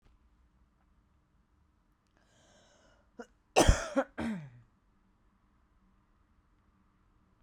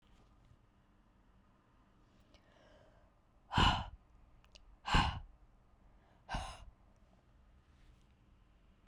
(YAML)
cough_length: 7.4 s
cough_amplitude: 11129
cough_signal_mean_std_ratio: 0.21
exhalation_length: 8.9 s
exhalation_amplitude: 4990
exhalation_signal_mean_std_ratio: 0.27
survey_phase: beta (2021-08-13 to 2022-03-07)
age: 18-44
gender: Female
wearing_mask: 'No'
symptom_cough_any: true
symptom_runny_or_blocked_nose: true
symptom_sore_throat: true
symptom_onset: 2 days
smoker_status: Ex-smoker
respiratory_condition_asthma: true
respiratory_condition_other: false
recruitment_source: REACT
submission_delay: 2 days
covid_test_result: Negative
covid_test_method: RT-qPCR